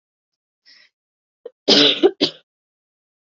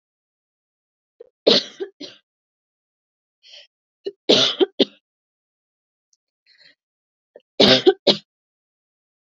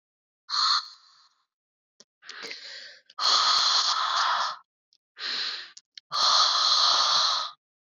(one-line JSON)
{"cough_length": "3.2 s", "cough_amplitude": 31501, "cough_signal_mean_std_ratio": 0.29, "three_cough_length": "9.2 s", "three_cough_amplitude": 30741, "three_cough_signal_mean_std_ratio": 0.24, "exhalation_length": "7.9 s", "exhalation_amplitude": 12627, "exhalation_signal_mean_std_ratio": 0.6, "survey_phase": "beta (2021-08-13 to 2022-03-07)", "age": "18-44", "gender": "Female", "wearing_mask": "No", "symptom_none": true, "smoker_status": "Never smoked", "respiratory_condition_asthma": false, "respiratory_condition_other": false, "recruitment_source": "REACT", "submission_delay": "1 day", "covid_test_result": "Negative", "covid_test_method": "RT-qPCR", "influenza_a_test_result": "Negative", "influenza_b_test_result": "Negative"}